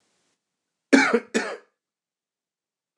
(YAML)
cough_length: 3.0 s
cough_amplitude: 27573
cough_signal_mean_std_ratio: 0.27
survey_phase: beta (2021-08-13 to 2022-03-07)
age: 18-44
gender: Male
wearing_mask: 'No'
symptom_none: true
smoker_status: Never smoked
respiratory_condition_asthma: false
respiratory_condition_other: false
recruitment_source: REACT
submission_delay: 1 day
covid_test_result: Negative
covid_test_method: RT-qPCR
influenza_a_test_result: Negative
influenza_b_test_result: Negative